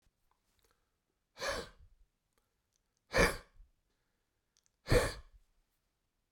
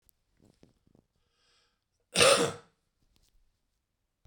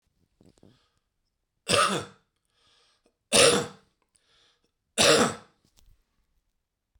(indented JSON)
{
  "exhalation_length": "6.3 s",
  "exhalation_amplitude": 7452,
  "exhalation_signal_mean_std_ratio": 0.24,
  "cough_length": "4.3 s",
  "cough_amplitude": 12517,
  "cough_signal_mean_std_ratio": 0.22,
  "three_cough_length": "7.0 s",
  "three_cough_amplitude": 22462,
  "three_cough_signal_mean_std_ratio": 0.3,
  "survey_phase": "beta (2021-08-13 to 2022-03-07)",
  "age": "45-64",
  "gender": "Male",
  "wearing_mask": "No",
  "symptom_cough_any": true,
  "symptom_runny_or_blocked_nose": true,
  "symptom_shortness_of_breath": true,
  "symptom_sore_throat": true,
  "symptom_fatigue": true,
  "symptom_onset": "12 days",
  "smoker_status": "Never smoked",
  "respiratory_condition_asthma": false,
  "respiratory_condition_other": true,
  "recruitment_source": "Test and Trace",
  "submission_delay": "3 days",
  "covid_test_result": "Positive",
  "covid_test_method": "RT-qPCR",
  "covid_ct_value": 18.4,
  "covid_ct_gene": "ORF1ab gene",
  "covid_ct_mean": 18.7,
  "covid_viral_load": "740000 copies/ml",
  "covid_viral_load_category": "Low viral load (10K-1M copies/ml)"
}